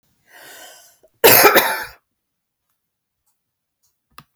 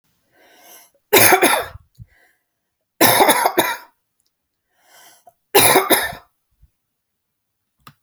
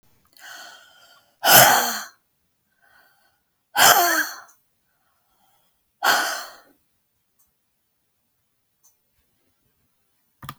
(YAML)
cough_length: 4.4 s
cough_amplitude: 32768
cough_signal_mean_std_ratio: 0.28
three_cough_length: 8.0 s
three_cough_amplitude: 32768
three_cough_signal_mean_std_ratio: 0.36
exhalation_length: 10.6 s
exhalation_amplitude: 32768
exhalation_signal_mean_std_ratio: 0.28
survey_phase: beta (2021-08-13 to 2022-03-07)
age: 65+
gender: Female
wearing_mask: 'No'
symptom_none: true
smoker_status: Ex-smoker
respiratory_condition_asthma: false
respiratory_condition_other: false
recruitment_source: REACT
submission_delay: 2 days
covid_test_result: Negative
covid_test_method: RT-qPCR